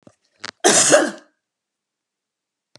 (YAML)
cough_length: 2.8 s
cough_amplitude: 32679
cough_signal_mean_std_ratio: 0.33
survey_phase: beta (2021-08-13 to 2022-03-07)
age: 65+
gender: Female
wearing_mask: 'No'
symptom_none: true
symptom_onset: 12 days
smoker_status: Ex-smoker
respiratory_condition_asthma: false
respiratory_condition_other: false
recruitment_source: REACT
submission_delay: 1 day
covid_test_result: Negative
covid_test_method: RT-qPCR